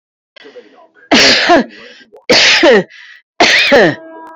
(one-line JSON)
{"three_cough_length": "4.4 s", "three_cough_amplitude": 32768, "three_cough_signal_mean_std_ratio": 0.6, "survey_phase": "beta (2021-08-13 to 2022-03-07)", "age": "45-64", "gender": "Female", "wearing_mask": "No", "symptom_none": true, "smoker_status": "Ex-smoker", "respiratory_condition_asthma": false, "respiratory_condition_other": false, "recruitment_source": "REACT", "submission_delay": "2 days", "covid_test_result": "Negative", "covid_test_method": "RT-qPCR", "influenza_a_test_result": "Negative", "influenza_b_test_result": "Negative"}